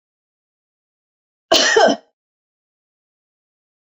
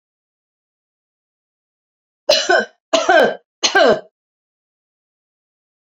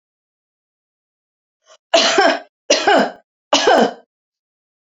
{"cough_length": "3.8 s", "cough_amplitude": 32768, "cough_signal_mean_std_ratio": 0.27, "three_cough_length": "6.0 s", "three_cough_amplitude": 32767, "three_cough_signal_mean_std_ratio": 0.32, "exhalation_length": "4.9 s", "exhalation_amplitude": 31068, "exhalation_signal_mean_std_ratio": 0.4, "survey_phase": "alpha (2021-03-01 to 2021-08-12)", "age": "65+", "gender": "Female", "wearing_mask": "No", "symptom_none": true, "smoker_status": "Never smoked", "respiratory_condition_asthma": false, "respiratory_condition_other": false, "recruitment_source": "REACT", "submission_delay": "1 day", "covid_test_result": "Negative", "covid_test_method": "RT-qPCR"}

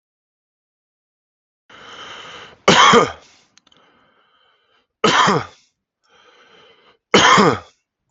{"three_cough_length": "8.1 s", "three_cough_amplitude": 32768, "three_cough_signal_mean_std_ratio": 0.32, "survey_phase": "beta (2021-08-13 to 2022-03-07)", "age": "18-44", "gender": "Male", "wearing_mask": "No", "symptom_none": true, "smoker_status": "Ex-smoker", "respiratory_condition_asthma": false, "respiratory_condition_other": false, "recruitment_source": "REACT", "submission_delay": "1 day", "covid_test_result": "Negative", "covid_test_method": "RT-qPCR", "influenza_a_test_result": "Negative", "influenza_b_test_result": "Negative"}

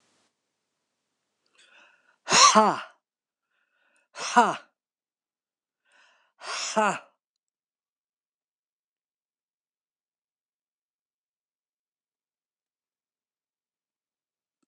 {"exhalation_length": "14.7 s", "exhalation_amplitude": 22087, "exhalation_signal_mean_std_ratio": 0.19, "survey_phase": "beta (2021-08-13 to 2022-03-07)", "age": "65+", "gender": "Male", "wearing_mask": "No", "symptom_cough_any": true, "smoker_status": "Never smoked", "respiratory_condition_asthma": false, "respiratory_condition_other": false, "recruitment_source": "REACT", "submission_delay": "2 days", "covid_test_result": "Negative", "covid_test_method": "RT-qPCR", "influenza_a_test_result": "Negative", "influenza_b_test_result": "Negative"}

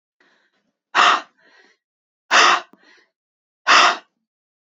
{"exhalation_length": "4.6 s", "exhalation_amplitude": 29937, "exhalation_signal_mean_std_ratio": 0.34, "survey_phase": "beta (2021-08-13 to 2022-03-07)", "age": "18-44", "gender": "Female", "wearing_mask": "No", "symptom_cough_any": true, "symptom_onset": "2 days", "smoker_status": "Never smoked", "respiratory_condition_asthma": false, "respiratory_condition_other": false, "recruitment_source": "REACT", "submission_delay": "1 day", "covid_test_result": "Negative", "covid_test_method": "RT-qPCR", "influenza_a_test_result": "Negative", "influenza_b_test_result": "Negative"}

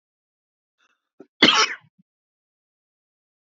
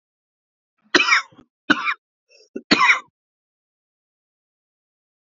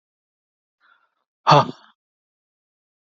{"cough_length": "3.4 s", "cough_amplitude": 29297, "cough_signal_mean_std_ratio": 0.21, "three_cough_length": "5.2 s", "three_cough_amplitude": 32767, "three_cough_signal_mean_std_ratio": 0.28, "exhalation_length": "3.2 s", "exhalation_amplitude": 29518, "exhalation_signal_mean_std_ratio": 0.19, "survey_phase": "alpha (2021-03-01 to 2021-08-12)", "age": "18-44", "gender": "Male", "wearing_mask": "No", "symptom_none": true, "smoker_status": "Never smoked", "respiratory_condition_asthma": true, "respiratory_condition_other": false, "recruitment_source": "REACT", "submission_delay": "2 days", "covid_test_result": "Negative", "covid_test_method": "RT-qPCR"}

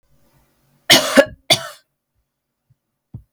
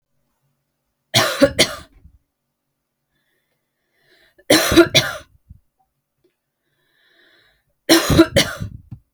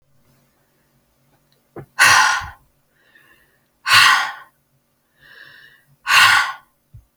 {"cough_length": "3.3 s", "cough_amplitude": 32768, "cough_signal_mean_std_ratio": 0.26, "three_cough_length": "9.1 s", "three_cough_amplitude": 32768, "three_cough_signal_mean_std_ratio": 0.3, "exhalation_length": "7.2 s", "exhalation_amplitude": 32768, "exhalation_signal_mean_std_ratio": 0.35, "survey_phase": "beta (2021-08-13 to 2022-03-07)", "age": "18-44", "gender": "Female", "wearing_mask": "No", "symptom_runny_or_blocked_nose": true, "smoker_status": "Ex-smoker", "respiratory_condition_asthma": false, "respiratory_condition_other": false, "recruitment_source": "REACT", "submission_delay": "2 days", "covid_test_result": "Negative", "covid_test_method": "RT-qPCR", "influenza_a_test_result": "Negative", "influenza_b_test_result": "Negative"}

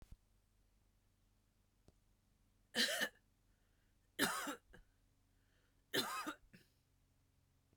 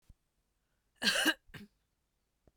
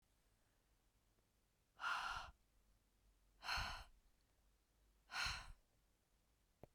{"three_cough_length": "7.8 s", "three_cough_amplitude": 2500, "three_cough_signal_mean_std_ratio": 0.31, "cough_length": "2.6 s", "cough_amplitude": 5392, "cough_signal_mean_std_ratio": 0.29, "exhalation_length": "6.7 s", "exhalation_amplitude": 1189, "exhalation_signal_mean_std_ratio": 0.38, "survey_phase": "beta (2021-08-13 to 2022-03-07)", "age": "45-64", "gender": "Female", "wearing_mask": "No", "symptom_fatigue": true, "symptom_onset": "12 days", "smoker_status": "Ex-smoker", "respiratory_condition_asthma": false, "respiratory_condition_other": false, "recruitment_source": "REACT", "submission_delay": "2 days", "covid_test_result": "Negative", "covid_test_method": "RT-qPCR", "influenza_a_test_result": "Negative", "influenza_b_test_result": "Negative"}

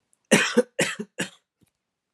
{"three_cough_length": "2.1 s", "three_cough_amplitude": 20289, "three_cough_signal_mean_std_ratio": 0.35, "survey_phase": "alpha (2021-03-01 to 2021-08-12)", "age": "18-44", "gender": "Male", "wearing_mask": "No", "symptom_cough_any": true, "symptom_fatigue": true, "symptom_onset": "6 days", "smoker_status": "Never smoked", "respiratory_condition_asthma": false, "respiratory_condition_other": false, "recruitment_source": "Test and Trace", "submission_delay": "3 days", "covid_test_result": "Positive", "covid_test_method": "RT-qPCR"}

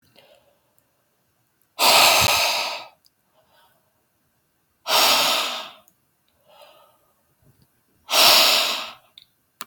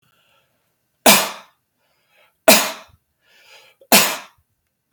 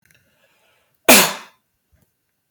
{"exhalation_length": "9.7 s", "exhalation_amplitude": 32768, "exhalation_signal_mean_std_ratio": 0.4, "three_cough_length": "4.9 s", "three_cough_amplitude": 32768, "three_cough_signal_mean_std_ratio": 0.28, "cough_length": "2.5 s", "cough_amplitude": 32768, "cough_signal_mean_std_ratio": 0.24, "survey_phase": "beta (2021-08-13 to 2022-03-07)", "age": "18-44", "gender": "Male", "wearing_mask": "No", "symptom_none": true, "smoker_status": "Ex-smoker", "respiratory_condition_asthma": false, "respiratory_condition_other": false, "recruitment_source": "REACT", "submission_delay": "1 day", "covid_test_result": "Negative", "covid_test_method": "RT-qPCR", "influenza_a_test_result": "Negative", "influenza_b_test_result": "Negative"}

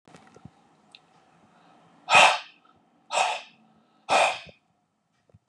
{"exhalation_length": "5.5 s", "exhalation_amplitude": 23927, "exhalation_signal_mean_std_ratio": 0.3, "survey_phase": "beta (2021-08-13 to 2022-03-07)", "age": "45-64", "gender": "Male", "wearing_mask": "No", "symptom_none": true, "smoker_status": "Never smoked", "respiratory_condition_asthma": false, "respiratory_condition_other": false, "recruitment_source": "REACT", "submission_delay": "5 days", "covid_test_result": "Negative", "covid_test_method": "RT-qPCR", "influenza_a_test_result": "Negative", "influenza_b_test_result": "Negative"}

